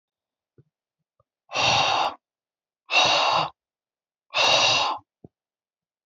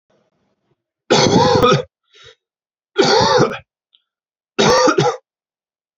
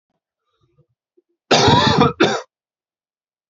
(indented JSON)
{
  "exhalation_length": "6.1 s",
  "exhalation_amplitude": 15932,
  "exhalation_signal_mean_std_ratio": 0.46,
  "three_cough_length": "6.0 s",
  "three_cough_amplitude": 29681,
  "three_cough_signal_mean_std_ratio": 0.48,
  "cough_length": "3.5 s",
  "cough_amplitude": 31249,
  "cough_signal_mean_std_ratio": 0.39,
  "survey_phase": "beta (2021-08-13 to 2022-03-07)",
  "age": "18-44",
  "gender": "Male",
  "wearing_mask": "No",
  "symptom_cough_any": true,
  "symptom_new_continuous_cough": true,
  "symptom_runny_or_blocked_nose": true,
  "symptom_sore_throat": true,
  "symptom_onset": "4 days",
  "smoker_status": "Never smoked",
  "respiratory_condition_asthma": false,
  "respiratory_condition_other": false,
  "recruitment_source": "Test and Trace",
  "submission_delay": "1 day",
  "covid_test_result": "Positive",
  "covid_test_method": "ePCR"
}